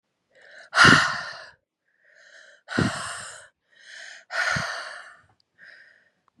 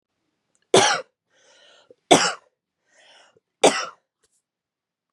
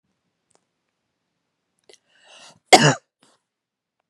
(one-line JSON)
{"exhalation_length": "6.4 s", "exhalation_amplitude": 28376, "exhalation_signal_mean_std_ratio": 0.33, "three_cough_length": "5.1 s", "three_cough_amplitude": 32266, "three_cough_signal_mean_std_ratio": 0.26, "cough_length": "4.1 s", "cough_amplitude": 32768, "cough_signal_mean_std_ratio": 0.17, "survey_phase": "beta (2021-08-13 to 2022-03-07)", "age": "18-44", "gender": "Female", "wearing_mask": "No", "symptom_cough_any": true, "symptom_new_continuous_cough": true, "symptom_runny_or_blocked_nose": true, "symptom_shortness_of_breath": true, "symptom_fatigue": true, "symptom_fever_high_temperature": true, "symptom_headache": true, "symptom_change_to_sense_of_smell_or_taste": true, "symptom_loss_of_taste": true, "symptom_other": true, "symptom_onset": "4 days", "smoker_status": "Ex-smoker", "respiratory_condition_asthma": true, "respiratory_condition_other": false, "recruitment_source": "Test and Trace", "submission_delay": "1 day", "covid_test_result": "Positive", "covid_test_method": "RT-qPCR", "covid_ct_value": 14.5, "covid_ct_gene": "ORF1ab gene"}